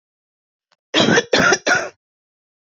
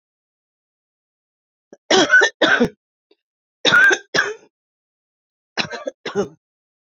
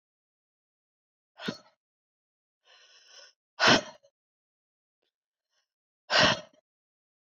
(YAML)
cough_length: 2.7 s
cough_amplitude: 27472
cough_signal_mean_std_ratio: 0.42
three_cough_length: 6.8 s
three_cough_amplitude: 30841
three_cough_signal_mean_std_ratio: 0.36
exhalation_length: 7.3 s
exhalation_amplitude: 13737
exhalation_signal_mean_std_ratio: 0.21
survey_phase: beta (2021-08-13 to 2022-03-07)
age: 65+
gender: Female
wearing_mask: 'No'
symptom_cough_any: true
symptom_runny_or_blocked_nose: true
symptom_sore_throat: true
symptom_fatigue: true
symptom_onset: 2 days
smoker_status: Never smoked
respiratory_condition_asthma: false
respiratory_condition_other: false
recruitment_source: Test and Trace
submission_delay: 1 day
covid_test_result: Positive
covid_test_method: RT-qPCR
covid_ct_value: 35.9
covid_ct_gene: N gene